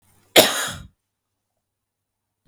{"cough_length": "2.5 s", "cough_amplitude": 32768, "cough_signal_mean_std_ratio": 0.24, "survey_phase": "beta (2021-08-13 to 2022-03-07)", "age": "45-64", "gender": "Female", "wearing_mask": "No", "symptom_fatigue": true, "smoker_status": "Ex-smoker", "respiratory_condition_asthma": false, "respiratory_condition_other": false, "recruitment_source": "REACT", "submission_delay": "2 days", "covid_test_result": "Negative", "covid_test_method": "RT-qPCR", "influenza_a_test_result": "Negative", "influenza_b_test_result": "Negative"}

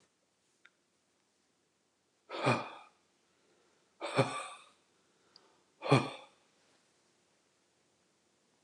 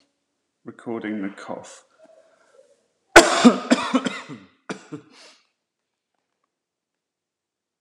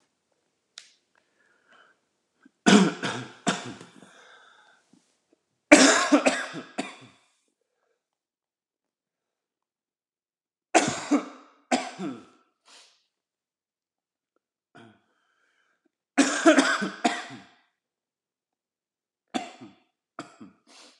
{"exhalation_length": "8.6 s", "exhalation_amplitude": 7728, "exhalation_signal_mean_std_ratio": 0.24, "cough_length": "7.8 s", "cough_amplitude": 32768, "cough_signal_mean_std_ratio": 0.24, "three_cough_length": "21.0 s", "three_cough_amplitude": 32768, "three_cough_signal_mean_std_ratio": 0.26, "survey_phase": "beta (2021-08-13 to 2022-03-07)", "age": "45-64", "gender": "Male", "wearing_mask": "No", "symptom_cough_any": true, "symptom_runny_or_blocked_nose": true, "symptom_shortness_of_breath": true, "symptom_sore_throat": true, "symptom_fatigue": true, "symptom_headache": true, "symptom_change_to_sense_of_smell_or_taste": true, "symptom_loss_of_taste": true, "symptom_onset": "3 days", "smoker_status": "Never smoked", "respiratory_condition_asthma": true, "respiratory_condition_other": false, "recruitment_source": "Test and Trace", "submission_delay": "2 days", "covid_test_result": "Positive", "covid_test_method": "RT-qPCR", "covid_ct_value": 22.6, "covid_ct_gene": "ORF1ab gene"}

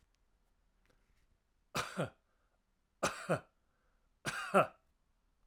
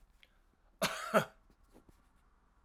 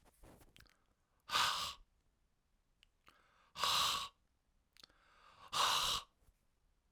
{"three_cough_length": "5.5 s", "three_cough_amplitude": 5681, "three_cough_signal_mean_std_ratio": 0.28, "cough_length": "2.6 s", "cough_amplitude": 6633, "cough_signal_mean_std_ratio": 0.28, "exhalation_length": "6.9 s", "exhalation_amplitude": 2990, "exhalation_signal_mean_std_ratio": 0.38, "survey_phase": "alpha (2021-03-01 to 2021-08-12)", "age": "45-64", "gender": "Male", "wearing_mask": "No", "symptom_abdominal_pain": true, "symptom_headache": true, "smoker_status": "Never smoked", "respiratory_condition_asthma": false, "respiratory_condition_other": false, "recruitment_source": "Test and Trace", "submission_delay": "1 day", "covid_test_result": "Positive", "covid_test_method": "RT-qPCR"}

